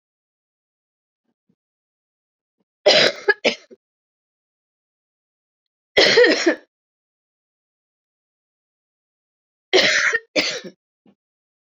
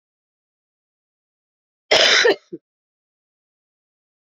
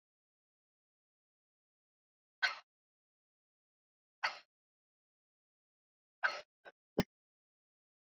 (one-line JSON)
{"three_cough_length": "11.6 s", "three_cough_amplitude": 28121, "three_cough_signal_mean_std_ratio": 0.29, "cough_length": "4.3 s", "cough_amplitude": 31716, "cough_signal_mean_std_ratio": 0.26, "exhalation_length": "8.0 s", "exhalation_amplitude": 4497, "exhalation_signal_mean_std_ratio": 0.16, "survey_phase": "beta (2021-08-13 to 2022-03-07)", "age": "45-64", "gender": "Female", "wearing_mask": "No", "symptom_new_continuous_cough": true, "symptom_fatigue": true, "symptom_onset": "3 days", "smoker_status": "Ex-smoker", "respiratory_condition_asthma": true, "respiratory_condition_other": false, "recruitment_source": "Test and Trace", "submission_delay": "1 day", "covid_test_result": "Positive", "covid_test_method": "RT-qPCR"}